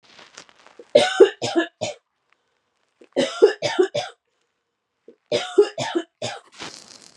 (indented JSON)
{
  "three_cough_length": "7.2 s",
  "three_cough_amplitude": 31863,
  "three_cough_signal_mean_std_ratio": 0.34,
  "survey_phase": "beta (2021-08-13 to 2022-03-07)",
  "age": "18-44",
  "gender": "Female",
  "wearing_mask": "No",
  "symptom_none": true,
  "symptom_onset": "13 days",
  "smoker_status": "Never smoked",
  "respiratory_condition_asthma": false,
  "respiratory_condition_other": false,
  "recruitment_source": "REACT",
  "submission_delay": "1 day",
  "covid_test_result": "Negative",
  "covid_test_method": "RT-qPCR",
  "influenza_a_test_result": "Negative",
  "influenza_b_test_result": "Negative"
}